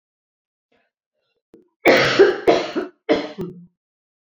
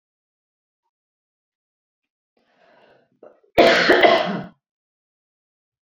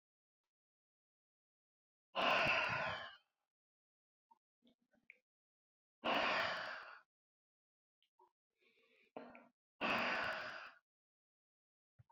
{"three_cough_length": "4.4 s", "three_cough_amplitude": 30089, "three_cough_signal_mean_std_ratio": 0.38, "cough_length": "5.9 s", "cough_amplitude": 31866, "cough_signal_mean_std_ratio": 0.28, "exhalation_length": "12.1 s", "exhalation_amplitude": 2184, "exhalation_signal_mean_std_ratio": 0.37, "survey_phase": "beta (2021-08-13 to 2022-03-07)", "age": "65+", "gender": "Female", "wearing_mask": "No", "symptom_none": true, "smoker_status": "Never smoked", "respiratory_condition_asthma": false, "respiratory_condition_other": false, "recruitment_source": "REACT", "submission_delay": "3 days", "covid_test_result": "Negative", "covid_test_method": "RT-qPCR"}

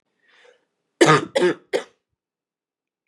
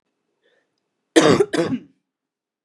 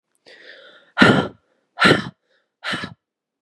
{"three_cough_length": "3.1 s", "three_cough_amplitude": 28214, "three_cough_signal_mean_std_ratio": 0.3, "cough_length": "2.6 s", "cough_amplitude": 32425, "cough_signal_mean_std_ratio": 0.33, "exhalation_length": "3.4 s", "exhalation_amplitude": 32768, "exhalation_signal_mean_std_ratio": 0.33, "survey_phase": "beta (2021-08-13 to 2022-03-07)", "age": "18-44", "gender": "Female", "wearing_mask": "No", "symptom_cough_any": true, "smoker_status": "Never smoked", "respiratory_condition_asthma": false, "respiratory_condition_other": false, "recruitment_source": "Test and Trace", "submission_delay": "2 days", "covid_test_result": "Positive", "covid_test_method": "RT-qPCR", "covid_ct_value": 21.8, "covid_ct_gene": "N gene"}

